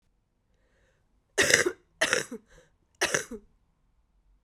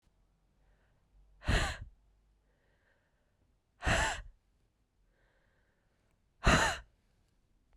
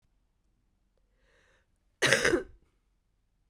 {"three_cough_length": "4.4 s", "three_cough_amplitude": 22960, "three_cough_signal_mean_std_ratio": 0.3, "exhalation_length": "7.8 s", "exhalation_amplitude": 7351, "exhalation_signal_mean_std_ratio": 0.28, "cough_length": "3.5 s", "cough_amplitude": 21301, "cough_signal_mean_std_ratio": 0.26, "survey_phase": "beta (2021-08-13 to 2022-03-07)", "age": "18-44", "gender": "Female", "wearing_mask": "No", "symptom_cough_any": true, "symptom_runny_or_blocked_nose": true, "symptom_sore_throat": true, "symptom_fatigue": true, "symptom_change_to_sense_of_smell_or_taste": true, "symptom_loss_of_taste": true, "symptom_onset": "3 days", "smoker_status": "Never smoked", "respiratory_condition_asthma": false, "respiratory_condition_other": false, "recruitment_source": "Test and Trace", "submission_delay": "2 days", "covid_test_result": "Positive", "covid_test_method": "RT-qPCR", "covid_ct_value": 20.5, "covid_ct_gene": "ORF1ab gene", "covid_ct_mean": 20.8, "covid_viral_load": "150000 copies/ml", "covid_viral_load_category": "Low viral load (10K-1M copies/ml)"}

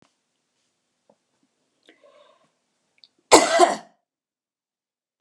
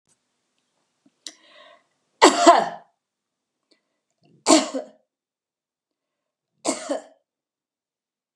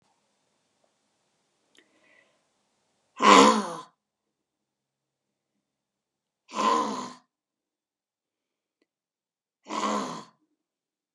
{"cough_length": "5.2 s", "cough_amplitude": 32767, "cough_signal_mean_std_ratio": 0.2, "three_cough_length": "8.4 s", "three_cough_amplitude": 32582, "three_cough_signal_mean_std_ratio": 0.23, "exhalation_length": "11.1 s", "exhalation_amplitude": 28179, "exhalation_signal_mean_std_ratio": 0.23, "survey_phase": "beta (2021-08-13 to 2022-03-07)", "age": "65+", "gender": "Female", "wearing_mask": "No", "symptom_none": true, "smoker_status": "Ex-smoker", "respiratory_condition_asthma": false, "respiratory_condition_other": false, "recruitment_source": "REACT", "submission_delay": "2 days", "covid_test_result": "Negative", "covid_test_method": "RT-qPCR", "influenza_a_test_result": "Negative", "influenza_b_test_result": "Negative"}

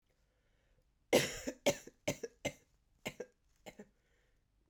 {"three_cough_length": "4.7 s", "three_cough_amplitude": 5476, "three_cough_signal_mean_std_ratio": 0.27, "survey_phase": "beta (2021-08-13 to 2022-03-07)", "age": "18-44", "gender": "Female", "wearing_mask": "No", "symptom_cough_any": true, "symptom_runny_or_blocked_nose": true, "symptom_fatigue": true, "symptom_headache": true, "symptom_change_to_sense_of_smell_or_taste": true, "symptom_loss_of_taste": true, "symptom_onset": "3 days", "smoker_status": "Never smoked", "respiratory_condition_asthma": false, "respiratory_condition_other": false, "recruitment_source": "Test and Trace", "submission_delay": "2 days", "covid_test_result": "Positive", "covid_test_method": "ePCR"}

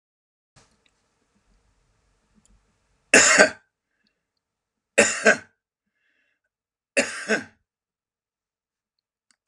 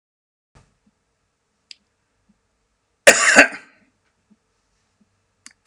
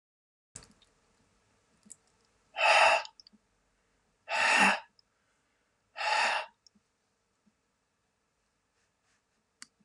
{"three_cough_length": "9.5 s", "three_cough_amplitude": 32119, "three_cough_signal_mean_std_ratio": 0.23, "cough_length": "5.7 s", "cough_amplitude": 32768, "cough_signal_mean_std_ratio": 0.19, "exhalation_length": "9.8 s", "exhalation_amplitude": 9974, "exhalation_signal_mean_std_ratio": 0.3, "survey_phase": "alpha (2021-03-01 to 2021-08-12)", "age": "65+", "gender": "Male", "wearing_mask": "No", "symptom_none": true, "smoker_status": "Ex-smoker", "respiratory_condition_asthma": false, "respiratory_condition_other": false, "recruitment_source": "REACT", "submission_delay": "2 days", "covid_test_result": "Negative", "covid_test_method": "RT-qPCR"}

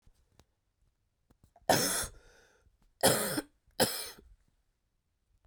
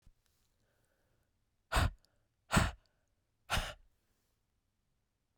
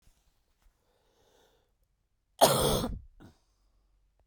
{"three_cough_length": "5.5 s", "three_cough_amplitude": 9849, "three_cough_signal_mean_std_ratio": 0.32, "exhalation_length": "5.4 s", "exhalation_amplitude": 6483, "exhalation_signal_mean_std_ratio": 0.25, "cough_length": "4.3 s", "cough_amplitude": 14494, "cough_signal_mean_std_ratio": 0.27, "survey_phase": "beta (2021-08-13 to 2022-03-07)", "age": "18-44", "gender": "Female", "wearing_mask": "No", "symptom_cough_any": true, "symptom_headache": true, "symptom_onset": "3 days", "smoker_status": "Ex-smoker", "respiratory_condition_asthma": false, "respiratory_condition_other": false, "recruitment_source": "Test and Trace", "submission_delay": "1 day", "covid_test_result": "Positive", "covid_test_method": "RT-qPCR", "covid_ct_value": 16.2, "covid_ct_gene": "ORF1ab gene", "covid_ct_mean": 16.6, "covid_viral_load": "3500000 copies/ml", "covid_viral_load_category": "High viral load (>1M copies/ml)"}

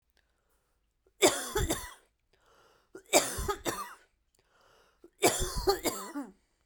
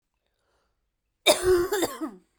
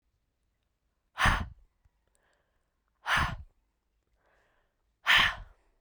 {"three_cough_length": "6.7 s", "three_cough_amplitude": 12503, "three_cough_signal_mean_std_ratio": 0.39, "cough_length": "2.4 s", "cough_amplitude": 16840, "cough_signal_mean_std_ratio": 0.42, "exhalation_length": "5.8 s", "exhalation_amplitude": 9574, "exhalation_signal_mean_std_ratio": 0.29, "survey_phase": "beta (2021-08-13 to 2022-03-07)", "age": "18-44", "gender": "Female", "wearing_mask": "No", "symptom_none": true, "smoker_status": "Never smoked", "respiratory_condition_asthma": true, "respiratory_condition_other": false, "recruitment_source": "REACT", "submission_delay": "0 days", "covid_test_result": "Negative", "covid_test_method": "RT-qPCR"}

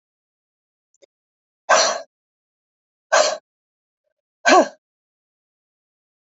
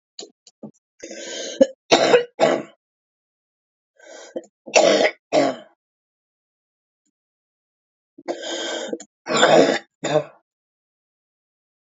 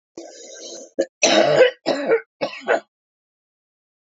{"exhalation_length": "6.3 s", "exhalation_amplitude": 27323, "exhalation_signal_mean_std_ratio": 0.25, "three_cough_length": "11.9 s", "three_cough_amplitude": 32767, "three_cough_signal_mean_std_ratio": 0.35, "cough_length": "4.1 s", "cough_amplitude": 26792, "cough_signal_mean_std_ratio": 0.43, "survey_phase": "beta (2021-08-13 to 2022-03-07)", "age": "45-64", "gender": "Female", "wearing_mask": "No", "symptom_cough_any": true, "symptom_runny_or_blocked_nose": true, "symptom_sore_throat": true, "symptom_onset": "7 days", "smoker_status": "Ex-smoker", "respiratory_condition_asthma": false, "respiratory_condition_other": false, "recruitment_source": "REACT", "submission_delay": "0 days", "covid_test_result": "Negative", "covid_test_method": "RT-qPCR", "influenza_a_test_result": "Negative", "influenza_b_test_result": "Negative"}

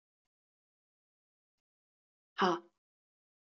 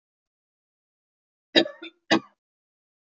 {"exhalation_length": "3.6 s", "exhalation_amplitude": 4987, "exhalation_signal_mean_std_ratio": 0.18, "cough_length": "3.2 s", "cough_amplitude": 25492, "cough_signal_mean_std_ratio": 0.19, "survey_phase": "beta (2021-08-13 to 2022-03-07)", "age": "45-64", "gender": "Female", "wearing_mask": "No", "symptom_cough_any": true, "symptom_onset": "11 days", "smoker_status": "Never smoked", "respiratory_condition_asthma": true, "respiratory_condition_other": false, "recruitment_source": "REACT", "submission_delay": "6 days", "covid_test_result": "Negative", "covid_test_method": "RT-qPCR", "influenza_a_test_result": "Negative", "influenza_b_test_result": "Negative"}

